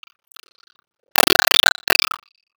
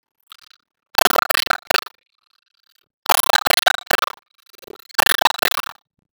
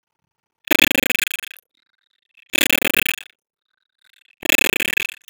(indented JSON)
{
  "cough_length": "2.6 s",
  "cough_amplitude": 32768,
  "cough_signal_mean_std_ratio": 0.28,
  "three_cough_length": "6.1 s",
  "three_cough_amplitude": 32766,
  "three_cough_signal_mean_std_ratio": 0.28,
  "exhalation_length": "5.3 s",
  "exhalation_amplitude": 32768,
  "exhalation_signal_mean_std_ratio": 0.28,
  "survey_phase": "beta (2021-08-13 to 2022-03-07)",
  "age": "65+",
  "gender": "Male",
  "wearing_mask": "No",
  "symptom_cough_any": true,
  "symptom_fatigue": true,
  "symptom_headache": true,
  "symptom_other": true,
  "symptom_onset": "2 days",
  "smoker_status": "Never smoked",
  "respiratory_condition_asthma": false,
  "respiratory_condition_other": false,
  "recruitment_source": "Test and Trace",
  "submission_delay": "1 day",
  "covid_test_result": "Positive",
  "covid_test_method": "RT-qPCR",
  "covid_ct_value": 15.9,
  "covid_ct_gene": "ORF1ab gene",
  "covid_ct_mean": 16.2,
  "covid_viral_load": "4700000 copies/ml",
  "covid_viral_load_category": "High viral load (>1M copies/ml)"
}